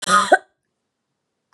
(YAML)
cough_length: 1.5 s
cough_amplitude: 28936
cough_signal_mean_std_ratio: 0.32
survey_phase: beta (2021-08-13 to 2022-03-07)
age: 18-44
gender: Female
wearing_mask: 'No'
symptom_runny_or_blocked_nose: true
symptom_fatigue: true
symptom_fever_high_temperature: true
symptom_headache: true
symptom_change_to_sense_of_smell_or_taste: true
smoker_status: Never smoked
respiratory_condition_asthma: false
respiratory_condition_other: false
recruitment_source: Test and Trace
submission_delay: 2 days
covid_test_result: Positive
covid_test_method: RT-qPCR
covid_ct_value: 21.6
covid_ct_gene: ORF1ab gene